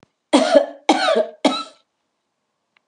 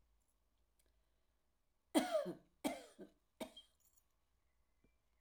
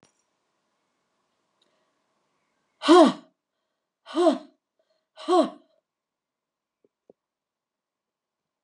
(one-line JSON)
{"cough_length": "2.9 s", "cough_amplitude": 32423, "cough_signal_mean_std_ratio": 0.43, "three_cough_length": "5.2 s", "three_cough_amplitude": 3272, "three_cough_signal_mean_std_ratio": 0.26, "exhalation_length": "8.6 s", "exhalation_amplitude": 22430, "exhalation_signal_mean_std_ratio": 0.22, "survey_phase": "alpha (2021-03-01 to 2021-08-12)", "age": "65+", "gender": "Female", "wearing_mask": "No", "symptom_none": true, "smoker_status": "Never smoked", "respiratory_condition_asthma": false, "respiratory_condition_other": false, "recruitment_source": "REACT", "submission_delay": "2 days", "covid_test_result": "Negative", "covid_test_method": "RT-qPCR"}